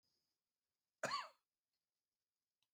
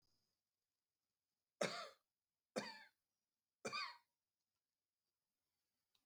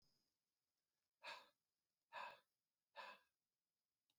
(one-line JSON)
{"cough_length": "2.7 s", "cough_amplitude": 1044, "cough_signal_mean_std_ratio": 0.23, "three_cough_length": "6.1 s", "three_cough_amplitude": 1719, "three_cough_signal_mean_std_ratio": 0.25, "exhalation_length": "4.2 s", "exhalation_amplitude": 279, "exhalation_signal_mean_std_ratio": 0.32, "survey_phase": "beta (2021-08-13 to 2022-03-07)", "age": "45-64", "gender": "Male", "wearing_mask": "No", "symptom_none": true, "smoker_status": "Ex-smoker", "respiratory_condition_asthma": false, "respiratory_condition_other": false, "recruitment_source": "REACT", "submission_delay": "3 days", "covid_test_result": "Negative", "covid_test_method": "RT-qPCR", "influenza_a_test_result": "Negative", "influenza_b_test_result": "Negative"}